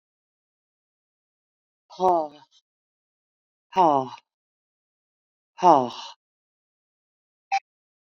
{"exhalation_length": "8.0 s", "exhalation_amplitude": 25779, "exhalation_signal_mean_std_ratio": 0.24, "survey_phase": "beta (2021-08-13 to 2022-03-07)", "age": "65+", "gender": "Female", "wearing_mask": "No", "symptom_none": true, "smoker_status": "Current smoker (1 to 10 cigarettes per day)", "respiratory_condition_asthma": false, "respiratory_condition_other": false, "recruitment_source": "REACT", "submission_delay": "1 day", "covid_test_result": "Negative", "covid_test_method": "RT-qPCR", "influenza_a_test_result": "Negative", "influenza_b_test_result": "Negative"}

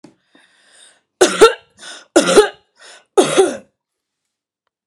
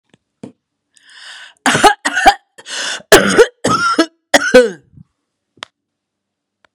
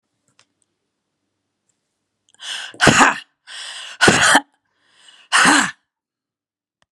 {"three_cough_length": "4.9 s", "three_cough_amplitude": 32768, "three_cough_signal_mean_std_ratio": 0.33, "cough_length": "6.7 s", "cough_amplitude": 32768, "cough_signal_mean_std_ratio": 0.39, "exhalation_length": "6.9 s", "exhalation_amplitude": 32768, "exhalation_signal_mean_std_ratio": 0.34, "survey_phase": "beta (2021-08-13 to 2022-03-07)", "age": "45-64", "gender": "Female", "wearing_mask": "No", "symptom_none": true, "smoker_status": "Ex-smoker", "respiratory_condition_asthma": false, "respiratory_condition_other": false, "recruitment_source": "REACT", "submission_delay": "3 days", "covid_test_result": "Negative", "covid_test_method": "RT-qPCR"}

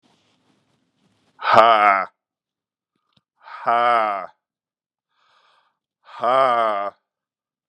{"exhalation_length": "7.7 s", "exhalation_amplitude": 32768, "exhalation_signal_mean_std_ratio": 0.35, "survey_phase": "beta (2021-08-13 to 2022-03-07)", "age": "45-64", "gender": "Male", "wearing_mask": "No", "symptom_cough_any": true, "symptom_runny_or_blocked_nose": true, "symptom_shortness_of_breath": true, "symptom_fatigue": true, "symptom_onset": "3 days", "smoker_status": "Never smoked", "respiratory_condition_asthma": true, "respiratory_condition_other": false, "recruitment_source": "Test and Trace", "submission_delay": "1 day", "covid_test_result": "Positive", "covid_test_method": "RT-qPCR", "covid_ct_value": 19.5, "covid_ct_gene": "ORF1ab gene", "covid_ct_mean": 19.6, "covid_viral_load": "360000 copies/ml", "covid_viral_load_category": "Low viral load (10K-1M copies/ml)"}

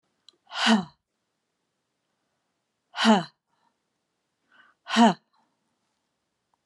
{"exhalation_length": "6.7 s", "exhalation_amplitude": 17087, "exhalation_signal_mean_std_ratio": 0.25, "survey_phase": "alpha (2021-03-01 to 2021-08-12)", "age": "65+", "gender": "Female", "wearing_mask": "No", "symptom_shortness_of_breath": true, "symptom_fatigue": true, "symptom_onset": "12 days", "smoker_status": "Never smoked", "respiratory_condition_asthma": false, "respiratory_condition_other": false, "recruitment_source": "REACT", "submission_delay": "1 day", "covid_test_result": "Negative", "covid_test_method": "RT-qPCR"}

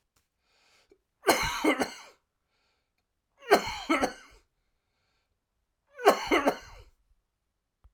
{"three_cough_length": "7.9 s", "three_cough_amplitude": 17939, "three_cough_signal_mean_std_ratio": 0.31, "survey_phase": "alpha (2021-03-01 to 2021-08-12)", "age": "45-64", "gender": "Male", "wearing_mask": "No", "symptom_cough_any": true, "smoker_status": "Never smoked", "respiratory_condition_asthma": false, "respiratory_condition_other": false, "recruitment_source": "Test and Trace", "submission_delay": "1 day", "covid_test_result": "Positive", "covid_test_method": "RT-qPCR", "covid_ct_value": 12.4, "covid_ct_gene": "ORF1ab gene", "covid_ct_mean": 13.5, "covid_viral_load": "37000000 copies/ml", "covid_viral_load_category": "High viral load (>1M copies/ml)"}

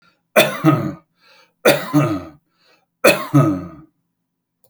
{"three_cough_length": "4.7 s", "three_cough_amplitude": 31755, "three_cough_signal_mean_std_ratio": 0.43, "survey_phase": "beta (2021-08-13 to 2022-03-07)", "age": "65+", "gender": "Male", "wearing_mask": "No", "symptom_none": true, "smoker_status": "Ex-smoker", "respiratory_condition_asthma": false, "respiratory_condition_other": false, "recruitment_source": "REACT", "submission_delay": "3 days", "covid_test_result": "Negative", "covid_test_method": "RT-qPCR"}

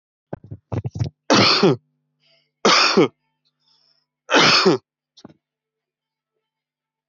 {"three_cough_length": "7.1 s", "three_cough_amplitude": 24178, "three_cough_signal_mean_std_ratio": 0.38, "survey_phase": "alpha (2021-03-01 to 2021-08-12)", "age": "18-44", "gender": "Male", "wearing_mask": "No", "symptom_none": true, "smoker_status": "Current smoker (1 to 10 cigarettes per day)", "respiratory_condition_asthma": true, "respiratory_condition_other": false, "recruitment_source": "REACT", "submission_delay": "2 days", "covid_test_result": "Negative", "covid_test_method": "RT-qPCR"}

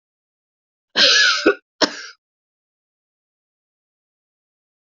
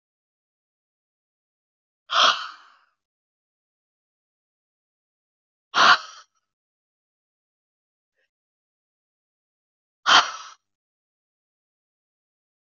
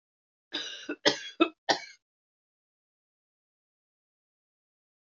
{"cough_length": "4.9 s", "cough_amplitude": 32767, "cough_signal_mean_std_ratio": 0.29, "exhalation_length": "12.8 s", "exhalation_amplitude": 24772, "exhalation_signal_mean_std_ratio": 0.18, "three_cough_length": "5.0 s", "three_cough_amplitude": 15730, "three_cough_signal_mean_std_ratio": 0.22, "survey_phase": "beta (2021-08-13 to 2022-03-07)", "age": "65+", "gender": "Female", "wearing_mask": "No", "symptom_cough_any": true, "symptom_runny_or_blocked_nose": true, "symptom_onset": "12 days", "smoker_status": "Never smoked", "respiratory_condition_asthma": false, "respiratory_condition_other": false, "recruitment_source": "REACT", "submission_delay": "2 days", "covid_test_result": "Negative", "covid_test_method": "RT-qPCR", "influenza_a_test_result": "Negative", "influenza_b_test_result": "Negative"}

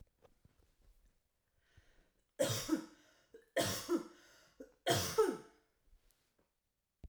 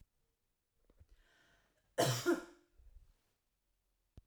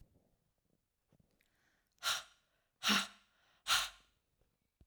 {"three_cough_length": "7.1 s", "three_cough_amplitude": 4072, "three_cough_signal_mean_std_ratio": 0.35, "cough_length": "4.3 s", "cough_amplitude": 3764, "cough_signal_mean_std_ratio": 0.26, "exhalation_length": "4.9 s", "exhalation_amplitude": 3832, "exhalation_signal_mean_std_ratio": 0.28, "survey_phase": "alpha (2021-03-01 to 2021-08-12)", "age": "18-44", "gender": "Female", "wearing_mask": "No", "symptom_none": true, "smoker_status": "Never smoked", "respiratory_condition_asthma": false, "respiratory_condition_other": false, "recruitment_source": "REACT", "submission_delay": "2 days", "covid_test_result": "Negative", "covid_test_method": "RT-qPCR"}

